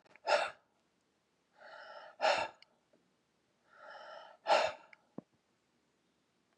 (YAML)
exhalation_length: 6.6 s
exhalation_amplitude: 4970
exhalation_signal_mean_std_ratio: 0.3
survey_phase: beta (2021-08-13 to 2022-03-07)
age: 65+
gender: Male
wearing_mask: 'No'
symptom_diarrhoea: true
smoker_status: Ex-smoker
respiratory_condition_asthma: false
respiratory_condition_other: false
recruitment_source: REACT
submission_delay: 1 day
covid_test_result: Negative
covid_test_method: RT-qPCR
influenza_a_test_result: Negative
influenza_b_test_result: Negative